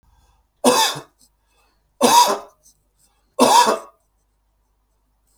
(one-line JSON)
{"three_cough_length": "5.4 s", "three_cough_amplitude": 32766, "three_cough_signal_mean_std_ratio": 0.36, "survey_phase": "beta (2021-08-13 to 2022-03-07)", "age": "45-64", "gender": "Male", "wearing_mask": "No", "symptom_none": true, "smoker_status": "Ex-smoker", "respiratory_condition_asthma": false, "respiratory_condition_other": false, "recruitment_source": "REACT", "submission_delay": "3 days", "covid_test_result": "Negative", "covid_test_method": "RT-qPCR", "influenza_a_test_result": "Negative", "influenza_b_test_result": "Negative"}